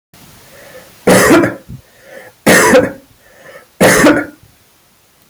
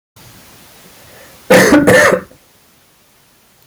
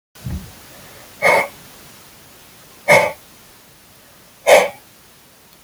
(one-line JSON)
{"three_cough_length": "5.3 s", "three_cough_amplitude": 32768, "three_cough_signal_mean_std_ratio": 0.48, "cough_length": "3.7 s", "cough_amplitude": 32768, "cough_signal_mean_std_ratio": 0.41, "exhalation_length": "5.6 s", "exhalation_amplitude": 30491, "exhalation_signal_mean_std_ratio": 0.33, "survey_phase": "alpha (2021-03-01 to 2021-08-12)", "age": "45-64", "gender": "Male", "wearing_mask": "No", "symptom_none": true, "smoker_status": "Never smoked", "respiratory_condition_asthma": false, "respiratory_condition_other": false, "recruitment_source": "REACT", "submission_delay": "3 days", "covid_test_result": "Negative", "covid_test_method": "RT-qPCR"}